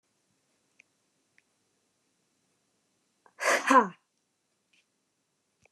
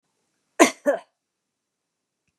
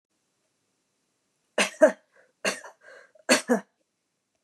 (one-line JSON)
{"exhalation_length": "5.7 s", "exhalation_amplitude": 14629, "exhalation_signal_mean_std_ratio": 0.2, "cough_length": "2.4 s", "cough_amplitude": 30738, "cough_signal_mean_std_ratio": 0.21, "three_cough_length": "4.4 s", "three_cough_amplitude": 17719, "three_cough_signal_mean_std_ratio": 0.25, "survey_phase": "beta (2021-08-13 to 2022-03-07)", "age": "45-64", "gender": "Female", "wearing_mask": "No", "symptom_none": true, "smoker_status": "Never smoked", "respiratory_condition_asthma": false, "respiratory_condition_other": false, "recruitment_source": "REACT", "submission_delay": "4 days", "covid_test_result": "Negative", "covid_test_method": "RT-qPCR"}